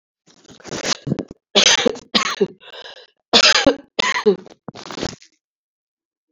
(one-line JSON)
{"cough_length": "6.3 s", "cough_amplitude": 32768, "cough_signal_mean_std_ratio": 0.4, "survey_phase": "alpha (2021-03-01 to 2021-08-12)", "age": "65+", "gender": "Female", "wearing_mask": "No", "symptom_cough_any": true, "symptom_onset": "4 days", "smoker_status": "Never smoked", "respiratory_condition_asthma": false, "respiratory_condition_other": false, "recruitment_source": "Test and Trace", "submission_delay": "2 days", "covid_test_result": "Positive", "covid_test_method": "RT-qPCR", "covid_ct_value": 15.5, "covid_ct_gene": "ORF1ab gene"}